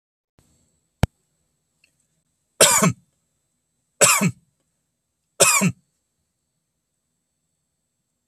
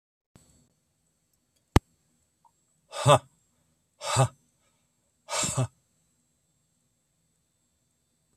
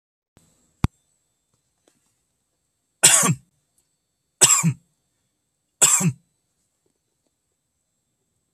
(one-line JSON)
{"cough_length": "8.3 s", "cough_amplitude": 32768, "cough_signal_mean_std_ratio": 0.26, "exhalation_length": "8.4 s", "exhalation_amplitude": 26651, "exhalation_signal_mean_std_ratio": 0.21, "three_cough_length": "8.5 s", "three_cough_amplitude": 32768, "three_cough_signal_mean_std_ratio": 0.25, "survey_phase": "beta (2021-08-13 to 2022-03-07)", "age": "65+", "gender": "Male", "wearing_mask": "No", "symptom_none": true, "smoker_status": "Never smoked", "respiratory_condition_asthma": false, "respiratory_condition_other": false, "recruitment_source": "REACT", "submission_delay": "3 days", "covid_test_result": "Negative", "covid_test_method": "RT-qPCR"}